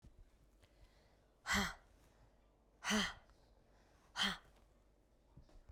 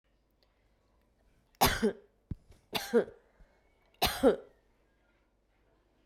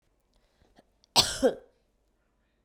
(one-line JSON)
{"exhalation_length": "5.7 s", "exhalation_amplitude": 2160, "exhalation_signal_mean_std_ratio": 0.34, "three_cough_length": "6.1 s", "three_cough_amplitude": 8581, "three_cough_signal_mean_std_ratio": 0.28, "cough_length": "2.6 s", "cough_amplitude": 18024, "cough_signal_mean_std_ratio": 0.24, "survey_phase": "beta (2021-08-13 to 2022-03-07)", "age": "45-64", "gender": "Female", "wearing_mask": "No", "symptom_cough_any": true, "symptom_new_continuous_cough": true, "symptom_runny_or_blocked_nose": true, "symptom_shortness_of_breath": true, "symptom_sore_throat": true, "symptom_abdominal_pain": true, "symptom_fatigue": true, "symptom_headache": true, "symptom_change_to_sense_of_smell_or_taste": true, "symptom_onset": "4 days", "smoker_status": "Never smoked", "respiratory_condition_asthma": false, "respiratory_condition_other": false, "recruitment_source": "Test and Trace", "submission_delay": "2 days", "covid_test_result": "Positive", "covid_test_method": "RT-qPCR", "covid_ct_value": 21.1, "covid_ct_gene": "ORF1ab gene", "covid_ct_mean": 22.1, "covid_viral_load": "56000 copies/ml", "covid_viral_load_category": "Low viral load (10K-1M copies/ml)"}